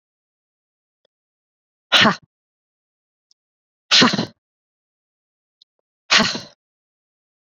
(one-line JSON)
{"exhalation_length": "7.6 s", "exhalation_amplitude": 32767, "exhalation_signal_mean_std_ratio": 0.24, "survey_phase": "beta (2021-08-13 to 2022-03-07)", "age": "45-64", "gender": "Female", "wearing_mask": "No", "symptom_cough_any": true, "symptom_new_continuous_cough": true, "symptom_runny_or_blocked_nose": true, "symptom_shortness_of_breath": true, "symptom_fatigue": true, "symptom_change_to_sense_of_smell_or_taste": true, "symptom_loss_of_taste": true, "symptom_onset": "5 days", "smoker_status": "Never smoked", "respiratory_condition_asthma": false, "respiratory_condition_other": false, "recruitment_source": "Test and Trace", "submission_delay": "2 days", "covid_test_result": "Positive", "covid_test_method": "RT-qPCR", "covid_ct_value": 15.2, "covid_ct_gene": "S gene", "covid_ct_mean": 15.6, "covid_viral_load": "7600000 copies/ml", "covid_viral_load_category": "High viral load (>1M copies/ml)"}